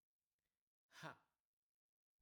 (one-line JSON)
{"exhalation_length": "2.2 s", "exhalation_amplitude": 331, "exhalation_signal_mean_std_ratio": 0.23, "survey_phase": "alpha (2021-03-01 to 2021-08-12)", "age": "18-44", "gender": "Male", "wearing_mask": "No", "symptom_none": true, "smoker_status": "Never smoked", "respiratory_condition_asthma": false, "respiratory_condition_other": false, "recruitment_source": "REACT", "submission_delay": "1 day", "covid_test_result": "Negative", "covid_test_method": "RT-qPCR"}